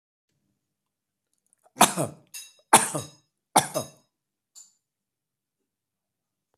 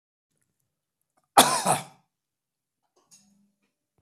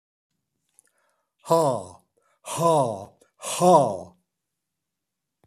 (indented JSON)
{
  "three_cough_length": "6.6 s",
  "three_cough_amplitude": 28099,
  "three_cough_signal_mean_std_ratio": 0.2,
  "cough_length": "4.0 s",
  "cough_amplitude": 26959,
  "cough_signal_mean_std_ratio": 0.21,
  "exhalation_length": "5.5 s",
  "exhalation_amplitude": 21143,
  "exhalation_signal_mean_std_ratio": 0.36,
  "survey_phase": "beta (2021-08-13 to 2022-03-07)",
  "age": "65+",
  "gender": "Female",
  "wearing_mask": "No",
  "symptom_cough_any": true,
  "symptom_loss_of_taste": true,
  "smoker_status": "Never smoked",
  "respiratory_condition_asthma": false,
  "respiratory_condition_other": false,
  "recruitment_source": "Test and Trace",
  "submission_delay": "1 day",
  "covid_test_result": "Positive",
  "covid_test_method": "RT-qPCR"
}